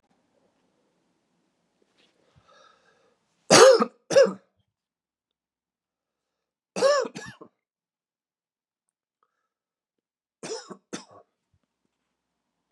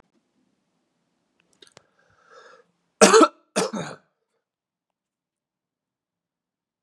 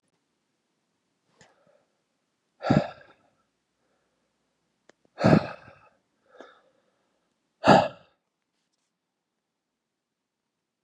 {"three_cough_length": "12.7 s", "three_cough_amplitude": 29259, "three_cough_signal_mean_std_ratio": 0.2, "cough_length": "6.8 s", "cough_amplitude": 32767, "cough_signal_mean_std_ratio": 0.19, "exhalation_length": "10.8 s", "exhalation_amplitude": 26468, "exhalation_signal_mean_std_ratio": 0.19, "survey_phase": "beta (2021-08-13 to 2022-03-07)", "age": "45-64", "gender": "Male", "wearing_mask": "No", "symptom_cough_any": true, "symptom_runny_or_blocked_nose": true, "symptom_sore_throat": true, "symptom_fatigue": true, "symptom_fever_high_temperature": true, "symptom_headache": true, "symptom_change_to_sense_of_smell_or_taste": true, "symptom_loss_of_taste": true, "symptom_onset": "3 days", "smoker_status": "Ex-smoker", "respiratory_condition_asthma": false, "respiratory_condition_other": false, "recruitment_source": "Test and Trace", "submission_delay": "1 day", "covid_test_result": "Positive", "covid_test_method": "ePCR"}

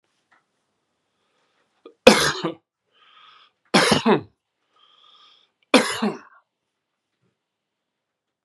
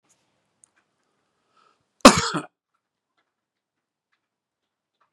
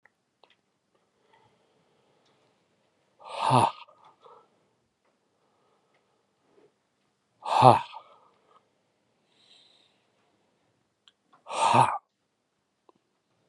{"three_cough_length": "8.4 s", "three_cough_amplitude": 32768, "three_cough_signal_mean_std_ratio": 0.25, "cough_length": "5.1 s", "cough_amplitude": 32768, "cough_signal_mean_std_ratio": 0.13, "exhalation_length": "13.5 s", "exhalation_amplitude": 28199, "exhalation_signal_mean_std_ratio": 0.21, "survey_phase": "beta (2021-08-13 to 2022-03-07)", "age": "45-64", "gender": "Male", "wearing_mask": "No", "symptom_none": true, "smoker_status": "Ex-smoker", "respiratory_condition_asthma": false, "respiratory_condition_other": true, "recruitment_source": "REACT", "submission_delay": "4 days", "covid_test_result": "Negative", "covid_test_method": "RT-qPCR"}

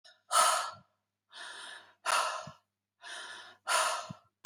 {"exhalation_length": "4.5 s", "exhalation_amplitude": 8034, "exhalation_signal_mean_std_ratio": 0.45, "survey_phase": "beta (2021-08-13 to 2022-03-07)", "age": "45-64", "gender": "Female", "wearing_mask": "No", "symptom_none": true, "smoker_status": "Ex-smoker", "respiratory_condition_asthma": false, "respiratory_condition_other": false, "recruitment_source": "REACT", "submission_delay": "2 days", "covid_test_result": "Negative", "covid_test_method": "RT-qPCR", "influenza_a_test_result": "Unknown/Void", "influenza_b_test_result": "Unknown/Void"}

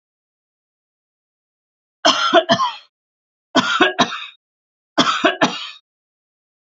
{"three_cough_length": "6.7 s", "three_cough_amplitude": 31993, "three_cough_signal_mean_std_ratio": 0.38, "survey_phase": "beta (2021-08-13 to 2022-03-07)", "age": "45-64", "gender": "Female", "wearing_mask": "No", "symptom_sore_throat": true, "symptom_fatigue": true, "symptom_headache": true, "symptom_onset": "3 days", "smoker_status": "Never smoked", "respiratory_condition_asthma": false, "respiratory_condition_other": false, "recruitment_source": "Test and Trace", "submission_delay": "1 day", "covid_test_result": "Positive", "covid_test_method": "RT-qPCR", "covid_ct_value": 22.4, "covid_ct_gene": "ORF1ab gene", "covid_ct_mean": 23.5, "covid_viral_load": "19000 copies/ml", "covid_viral_load_category": "Low viral load (10K-1M copies/ml)"}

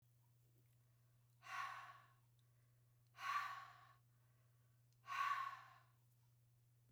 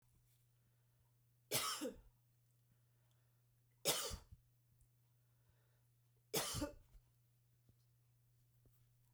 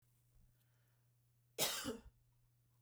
{"exhalation_length": "6.9 s", "exhalation_amplitude": 800, "exhalation_signal_mean_std_ratio": 0.42, "three_cough_length": "9.1 s", "three_cough_amplitude": 2245, "three_cough_signal_mean_std_ratio": 0.32, "cough_length": "2.8 s", "cough_amplitude": 2770, "cough_signal_mean_std_ratio": 0.32, "survey_phase": "beta (2021-08-13 to 2022-03-07)", "age": "45-64", "gender": "Female", "wearing_mask": "No", "symptom_none": true, "smoker_status": "Never smoked", "respiratory_condition_asthma": false, "respiratory_condition_other": false, "recruitment_source": "REACT", "submission_delay": "0 days", "covid_test_result": "Negative", "covid_test_method": "RT-qPCR"}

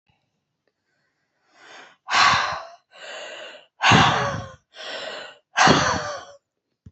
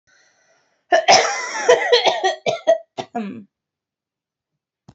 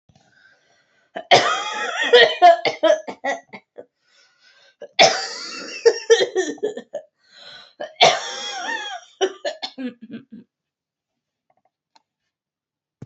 {"exhalation_length": "6.9 s", "exhalation_amplitude": 26735, "exhalation_signal_mean_std_ratio": 0.42, "cough_length": "4.9 s", "cough_amplitude": 32168, "cough_signal_mean_std_ratio": 0.43, "three_cough_length": "13.1 s", "three_cough_amplitude": 29873, "three_cough_signal_mean_std_ratio": 0.37, "survey_phase": "beta (2021-08-13 to 2022-03-07)", "age": "18-44", "wearing_mask": "No", "symptom_runny_or_blocked_nose": true, "symptom_change_to_sense_of_smell_or_taste": true, "symptom_other": true, "symptom_onset": "2 days", "smoker_status": "Never smoked", "respiratory_condition_asthma": false, "respiratory_condition_other": false, "recruitment_source": "Test and Trace", "submission_delay": "2 days", "covid_test_result": "Positive", "covid_test_method": "RT-qPCR", "covid_ct_value": 23.0, "covid_ct_gene": "ORF1ab gene"}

